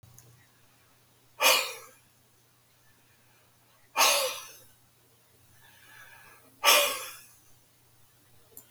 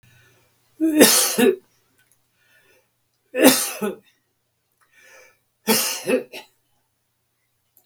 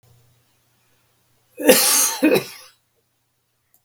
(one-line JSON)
{"exhalation_length": "8.7 s", "exhalation_amplitude": 14816, "exhalation_signal_mean_std_ratio": 0.3, "three_cough_length": "7.9 s", "three_cough_amplitude": 32768, "three_cough_signal_mean_std_ratio": 0.35, "cough_length": "3.8 s", "cough_amplitude": 32768, "cough_signal_mean_std_ratio": 0.35, "survey_phase": "beta (2021-08-13 to 2022-03-07)", "age": "65+", "gender": "Male", "wearing_mask": "No", "symptom_none": true, "smoker_status": "Ex-smoker", "respiratory_condition_asthma": false, "respiratory_condition_other": false, "recruitment_source": "REACT", "submission_delay": "1 day", "covid_test_result": "Negative", "covid_test_method": "RT-qPCR", "influenza_a_test_result": "Negative", "influenza_b_test_result": "Negative"}